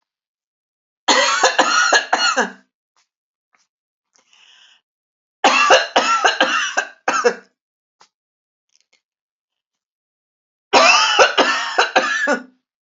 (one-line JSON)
{"three_cough_length": "13.0 s", "three_cough_amplitude": 30068, "three_cough_signal_mean_std_ratio": 0.45, "survey_phase": "alpha (2021-03-01 to 2021-08-12)", "age": "65+", "gender": "Female", "wearing_mask": "No", "symptom_none": true, "smoker_status": "Never smoked", "respiratory_condition_asthma": false, "respiratory_condition_other": false, "recruitment_source": "REACT", "submission_delay": "3 days", "covid_test_result": "Negative", "covid_test_method": "RT-qPCR"}